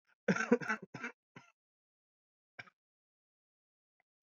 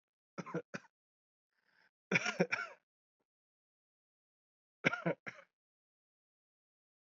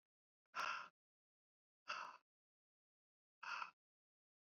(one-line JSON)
{"cough_length": "4.4 s", "cough_amplitude": 6088, "cough_signal_mean_std_ratio": 0.23, "three_cough_length": "7.1 s", "three_cough_amplitude": 5923, "three_cough_signal_mean_std_ratio": 0.24, "exhalation_length": "4.4 s", "exhalation_amplitude": 878, "exhalation_signal_mean_std_ratio": 0.32, "survey_phase": "alpha (2021-03-01 to 2021-08-12)", "age": "18-44", "gender": "Male", "wearing_mask": "No", "symptom_shortness_of_breath": true, "symptom_change_to_sense_of_smell_or_taste": true, "symptom_loss_of_taste": true, "symptom_onset": "6 days", "smoker_status": "Never smoked", "respiratory_condition_asthma": false, "respiratory_condition_other": false, "recruitment_source": "Test and Trace", "submission_delay": "2 days", "covid_test_result": "Positive", "covid_test_method": "RT-qPCR"}